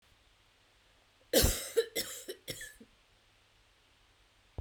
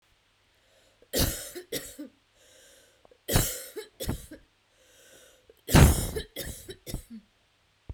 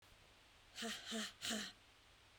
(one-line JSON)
{"cough_length": "4.6 s", "cough_amplitude": 8225, "cough_signal_mean_std_ratio": 0.3, "three_cough_length": "7.9 s", "three_cough_amplitude": 20548, "three_cough_signal_mean_std_ratio": 0.3, "exhalation_length": "2.4 s", "exhalation_amplitude": 1165, "exhalation_signal_mean_std_ratio": 0.58, "survey_phase": "beta (2021-08-13 to 2022-03-07)", "age": "45-64", "gender": "Female", "wearing_mask": "No", "symptom_none": true, "smoker_status": "Ex-smoker", "respiratory_condition_asthma": false, "respiratory_condition_other": false, "recruitment_source": "REACT", "submission_delay": "2 days", "covid_test_result": "Negative", "covid_test_method": "RT-qPCR"}